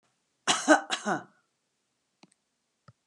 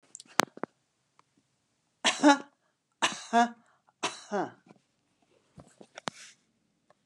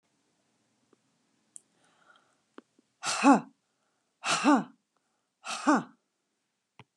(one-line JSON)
{"cough_length": "3.1 s", "cough_amplitude": 18440, "cough_signal_mean_std_ratio": 0.27, "three_cough_length": "7.1 s", "three_cough_amplitude": 32767, "three_cough_signal_mean_std_ratio": 0.24, "exhalation_length": "7.0 s", "exhalation_amplitude": 15669, "exhalation_signal_mean_std_ratio": 0.26, "survey_phase": "beta (2021-08-13 to 2022-03-07)", "age": "65+", "gender": "Female", "wearing_mask": "No", "symptom_none": true, "smoker_status": "Current smoker (1 to 10 cigarettes per day)", "respiratory_condition_asthma": false, "respiratory_condition_other": false, "recruitment_source": "REACT", "submission_delay": "4 days", "covid_test_result": "Negative", "covid_test_method": "RT-qPCR"}